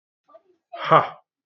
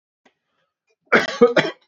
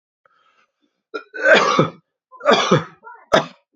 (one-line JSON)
{"exhalation_length": "1.5 s", "exhalation_amplitude": 27344, "exhalation_signal_mean_std_ratio": 0.29, "cough_length": "1.9 s", "cough_amplitude": 28055, "cough_signal_mean_std_ratio": 0.35, "three_cough_length": "3.8 s", "three_cough_amplitude": 32157, "three_cough_signal_mean_std_ratio": 0.41, "survey_phase": "beta (2021-08-13 to 2022-03-07)", "age": "18-44", "gender": "Male", "wearing_mask": "No", "symptom_cough_any": true, "symptom_sore_throat": true, "smoker_status": "Never smoked", "respiratory_condition_asthma": false, "respiratory_condition_other": false, "recruitment_source": "REACT", "submission_delay": "0 days", "covid_test_result": "Negative", "covid_test_method": "RT-qPCR"}